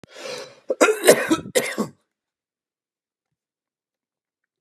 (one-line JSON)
{"cough_length": "4.6 s", "cough_amplitude": 32768, "cough_signal_mean_std_ratio": 0.31, "survey_phase": "beta (2021-08-13 to 2022-03-07)", "age": "65+", "gender": "Male", "wearing_mask": "No", "symptom_none": true, "smoker_status": "Never smoked", "respiratory_condition_asthma": false, "respiratory_condition_other": false, "recruitment_source": "REACT", "submission_delay": "3 days", "covid_test_result": "Negative", "covid_test_method": "RT-qPCR", "influenza_a_test_result": "Negative", "influenza_b_test_result": "Negative"}